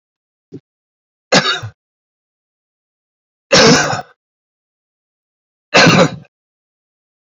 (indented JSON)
{
  "three_cough_length": "7.3 s",
  "three_cough_amplitude": 32767,
  "three_cough_signal_mean_std_ratio": 0.31,
  "survey_phase": "beta (2021-08-13 to 2022-03-07)",
  "age": "45-64",
  "gender": "Male",
  "wearing_mask": "No",
  "symptom_cough_any": true,
  "symptom_runny_or_blocked_nose": true,
  "symptom_fatigue": true,
  "symptom_fever_high_temperature": true,
  "symptom_headache": true,
  "smoker_status": "Never smoked",
  "respiratory_condition_asthma": false,
  "respiratory_condition_other": false,
  "recruitment_source": "Test and Trace",
  "submission_delay": "1 day",
  "covid_test_result": "Positive",
  "covid_test_method": "RT-qPCR",
  "covid_ct_value": 22.8,
  "covid_ct_gene": "ORF1ab gene",
  "covid_ct_mean": 23.4,
  "covid_viral_load": "21000 copies/ml",
  "covid_viral_load_category": "Low viral load (10K-1M copies/ml)"
}